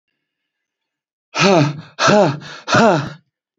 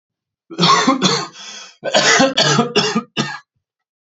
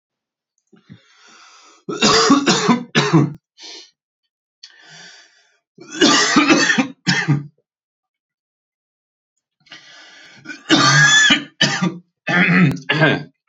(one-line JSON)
{"exhalation_length": "3.6 s", "exhalation_amplitude": 31477, "exhalation_signal_mean_std_ratio": 0.47, "cough_length": "4.1 s", "cough_amplitude": 31184, "cough_signal_mean_std_ratio": 0.59, "three_cough_length": "13.5 s", "three_cough_amplitude": 32466, "three_cough_signal_mean_std_ratio": 0.48, "survey_phase": "beta (2021-08-13 to 2022-03-07)", "age": "18-44", "gender": "Male", "wearing_mask": "No", "symptom_none": true, "smoker_status": "Current smoker (1 to 10 cigarettes per day)", "respiratory_condition_asthma": false, "respiratory_condition_other": false, "recruitment_source": "REACT", "submission_delay": "1 day", "covid_test_result": "Negative", "covid_test_method": "RT-qPCR"}